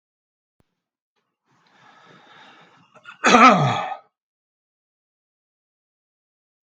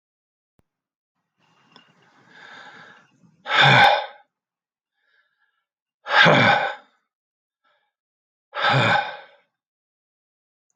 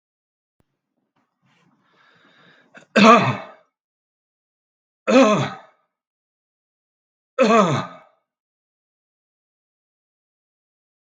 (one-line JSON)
{"cough_length": "6.7 s", "cough_amplitude": 32768, "cough_signal_mean_std_ratio": 0.23, "exhalation_length": "10.8 s", "exhalation_amplitude": 32766, "exhalation_signal_mean_std_ratio": 0.32, "three_cough_length": "11.2 s", "three_cough_amplitude": 32766, "three_cough_signal_mean_std_ratio": 0.26, "survey_phase": "beta (2021-08-13 to 2022-03-07)", "age": "65+", "gender": "Male", "wearing_mask": "No", "symptom_runny_or_blocked_nose": true, "smoker_status": "Never smoked", "respiratory_condition_asthma": true, "respiratory_condition_other": false, "recruitment_source": "REACT", "submission_delay": "3 days", "covid_test_result": "Negative", "covid_test_method": "RT-qPCR", "influenza_a_test_result": "Negative", "influenza_b_test_result": "Negative"}